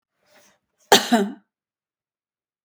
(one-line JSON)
{"cough_length": "2.6 s", "cough_amplitude": 32766, "cough_signal_mean_std_ratio": 0.25, "survey_phase": "beta (2021-08-13 to 2022-03-07)", "age": "65+", "gender": "Female", "wearing_mask": "No", "symptom_none": true, "smoker_status": "Never smoked", "respiratory_condition_asthma": false, "respiratory_condition_other": false, "recruitment_source": "REACT", "submission_delay": "1 day", "covid_test_result": "Negative", "covid_test_method": "RT-qPCR"}